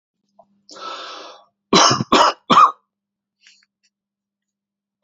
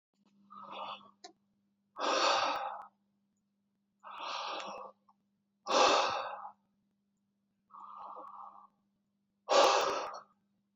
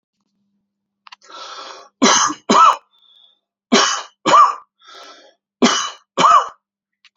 {"cough_length": "5.0 s", "cough_amplitude": 31449, "cough_signal_mean_std_ratio": 0.32, "exhalation_length": "10.8 s", "exhalation_amplitude": 8260, "exhalation_signal_mean_std_ratio": 0.4, "three_cough_length": "7.2 s", "three_cough_amplitude": 31546, "three_cough_signal_mean_std_ratio": 0.4, "survey_phase": "beta (2021-08-13 to 2022-03-07)", "age": "45-64", "gender": "Male", "wearing_mask": "No", "symptom_none": true, "symptom_onset": "4 days", "smoker_status": "Never smoked", "respiratory_condition_asthma": false, "respiratory_condition_other": false, "recruitment_source": "REACT", "submission_delay": "4 days", "covid_test_result": "Negative", "covid_test_method": "RT-qPCR", "influenza_a_test_result": "Negative", "influenza_b_test_result": "Negative"}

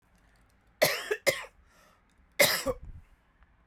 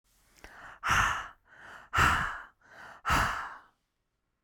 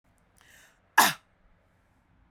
{"three_cough_length": "3.7 s", "three_cough_amplitude": 11650, "three_cough_signal_mean_std_ratio": 0.34, "exhalation_length": "4.4 s", "exhalation_amplitude": 8021, "exhalation_signal_mean_std_ratio": 0.46, "cough_length": "2.3 s", "cough_amplitude": 18768, "cough_signal_mean_std_ratio": 0.2, "survey_phase": "beta (2021-08-13 to 2022-03-07)", "age": "18-44", "gender": "Female", "wearing_mask": "No", "symptom_cough_any": true, "symptom_onset": "11 days", "smoker_status": "Never smoked", "respiratory_condition_asthma": false, "respiratory_condition_other": false, "recruitment_source": "REACT", "submission_delay": "5 days", "covid_test_result": "Negative", "covid_test_method": "RT-qPCR"}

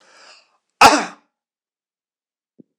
{"cough_length": "2.8 s", "cough_amplitude": 26028, "cough_signal_mean_std_ratio": 0.22, "survey_phase": "alpha (2021-03-01 to 2021-08-12)", "age": "65+", "gender": "Male", "wearing_mask": "No", "symptom_none": true, "smoker_status": "Never smoked", "respiratory_condition_asthma": false, "respiratory_condition_other": false, "recruitment_source": "REACT", "submission_delay": "1 day", "covid_test_result": "Negative", "covid_test_method": "RT-qPCR"}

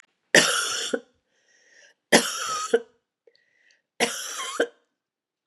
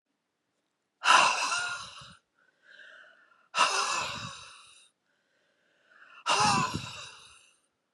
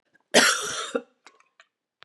{"three_cough_length": "5.5 s", "three_cough_amplitude": 31465, "three_cough_signal_mean_std_ratio": 0.37, "exhalation_length": "7.9 s", "exhalation_amplitude": 16118, "exhalation_signal_mean_std_ratio": 0.4, "cough_length": "2.0 s", "cough_amplitude": 21133, "cough_signal_mean_std_ratio": 0.36, "survey_phase": "beta (2021-08-13 to 2022-03-07)", "age": "45-64", "gender": "Female", "wearing_mask": "No", "symptom_runny_or_blocked_nose": true, "symptom_fatigue": true, "symptom_headache": true, "symptom_loss_of_taste": true, "symptom_onset": "3 days", "smoker_status": "Ex-smoker", "respiratory_condition_asthma": true, "respiratory_condition_other": false, "recruitment_source": "Test and Trace", "submission_delay": "1 day", "covid_test_result": "Positive", "covid_test_method": "RT-qPCR", "covid_ct_value": 23.5, "covid_ct_gene": "N gene"}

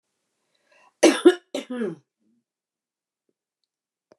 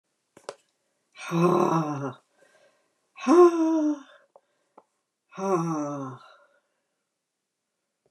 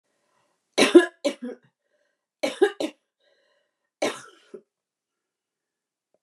{"cough_length": "4.2 s", "cough_amplitude": 24608, "cough_signal_mean_std_ratio": 0.22, "exhalation_length": "8.1 s", "exhalation_amplitude": 15797, "exhalation_signal_mean_std_ratio": 0.4, "three_cough_length": "6.2 s", "three_cough_amplitude": 28734, "three_cough_signal_mean_std_ratio": 0.22, "survey_phase": "beta (2021-08-13 to 2022-03-07)", "age": "65+", "gender": "Female", "wearing_mask": "No", "symptom_cough_any": true, "symptom_runny_or_blocked_nose": true, "symptom_sore_throat": true, "symptom_onset": "8 days", "smoker_status": "Never smoked", "respiratory_condition_asthma": false, "respiratory_condition_other": false, "recruitment_source": "REACT", "submission_delay": "1 day", "covid_test_result": "Negative", "covid_test_method": "RT-qPCR", "influenza_a_test_result": "Negative", "influenza_b_test_result": "Negative"}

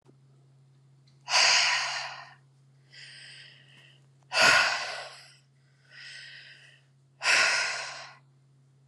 {"exhalation_length": "8.9 s", "exhalation_amplitude": 14450, "exhalation_signal_mean_std_ratio": 0.41, "survey_phase": "beta (2021-08-13 to 2022-03-07)", "age": "18-44", "gender": "Female", "wearing_mask": "No", "symptom_none": true, "smoker_status": "Current smoker (e-cigarettes or vapes only)", "respiratory_condition_asthma": false, "respiratory_condition_other": false, "recruitment_source": "REACT", "submission_delay": "4 days", "covid_test_result": "Negative", "covid_test_method": "RT-qPCR"}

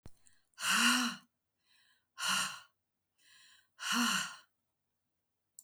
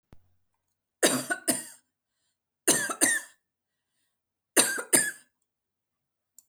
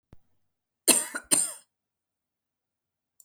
{"exhalation_length": "5.6 s", "exhalation_amplitude": 4808, "exhalation_signal_mean_std_ratio": 0.41, "three_cough_length": "6.5 s", "three_cough_amplitude": 20548, "three_cough_signal_mean_std_ratio": 0.33, "cough_length": "3.2 s", "cough_amplitude": 22679, "cough_signal_mean_std_ratio": 0.25, "survey_phase": "alpha (2021-03-01 to 2021-08-12)", "age": "45-64", "gender": "Female", "wearing_mask": "No", "symptom_fatigue": true, "symptom_headache": true, "symptom_onset": "12 days", "smoker_status": "Ex-smoker", "respiratory_condition_asthma": false, "respiratory_condition_other": false, "recruitment_source": "REACT", "submission_delay": "2 days", "covid_test_result": "Negative", "covid_test_method": "RT-qPCR"}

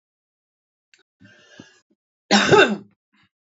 {"three_cough_length": "3.6 s", "three_cough_amplitude": 28130, "three_cough_signal_mean_std_ratio": 0.27, "survey_phase": "beta (2021-08-13 to 2022-03-07)", "age": "45-64", "gender": "Female", "wearing_mask": "No", "symptom_cough_any": true, "symptom_runny_or_blocked_nose": true, "symptom_sore_throat": true, "symptom_fatigue": true, "symptom_headache": true, "smoker_status": "Current smoker (1 to 10 cigarettes per day)", "respiratory_condition_asthma": false, "respiratory_condition_other": false, "recruitment_source": "Test and Trace", "submission_delay": "2 days", "covid_test_result": "Positive", "covid_test_method": "RT-qPCR", "covid_ct_value": 30.5, "covid_ct_gene": "ORF1ab gene", "covid_ct_mean": 31.7, "covid_viral_load": "39 copies/ml", "covid_viral_load_category": "Minimal viral load (< 10K copies/ml)"}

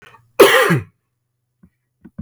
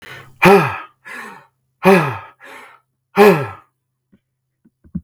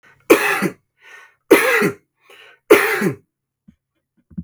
{"cough_length": "2.2 s", "cough_amplitude": 32768, "cough_signal_mean_std_ratio": 0.35, "exhalation_length": "5.0 s", "exhalation_amplitude": 32768, "exhalation_signal_mean_std_ratio": 0.36, "three_cough_length": "4.4 s", "three_cough_amplitude": 32768, "three_cough_signal_mean_std_ratio": 0.39, "survey_phase": "beta (2021-08-13 to 2022-03-07)", "age": "18-44", "gender": "Male", "wearing_mask": "No", "symptom_none": true, "smoker_status": "Never smoked", "respiratory_condition_asthma": false, "respiratory_condition_other": false, "recruitment_source": "REACT", "submission_delay": "2 days", "covid_test_result": "Negative", "covid_test_method": "RT-qPCR", "influenza_a_test_result": "Negative", "influenza_b_test_result": "Negative"}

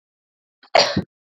{"cough_length": "1.4 s", "cough_amplitude": 32767, "cough_signal_mean_std_ratio": 0.3, "survey_phase": "beta (2021-08-13 to 2022-03-07)", "age": "18-44", "gender": "Female", "wearing_mask": "No", "symptom_none": true, "smoker_status": "Never smoked", "respiratory_condition_asthma": false, "respiratory_condition_other": false, "recruitment_source": "REACT", "submission_delay": "1 day", "covid_test_result": "Negative", "covid_test_method": "RT-qPCR"}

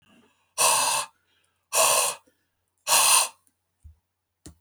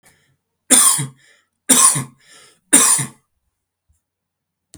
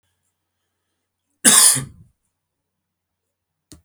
{"exhalation_length": "4.6 s", "exhalation_amplitude": 18305, "exhalation_signal_mean_std_ratio": 0.44, "three_cough_length": "4.8 s", "three_cough_amplitude": 32768, "three_cough_signal_mean_std_ratio": 0.36, "cough_length": "3.8 s", "cough_amplitude": 32768, "cough_signal_mean_std_ratio": 0.24, "survey_phase": "beta (2021-08-13 to 2022-03-07)", "age": "65+", "gender": "Male", "wearing_mask": "No", "symptom_none": true, "smoker_status": "Ex-smoker", "respiratory_condition_asthma": false, "respiratory_condition_other": false, "recruitment_source": "REACT", "submission_delay": "4 days", "covid_test_result": "Negative", "covid_test_method": "RT-qPCR"}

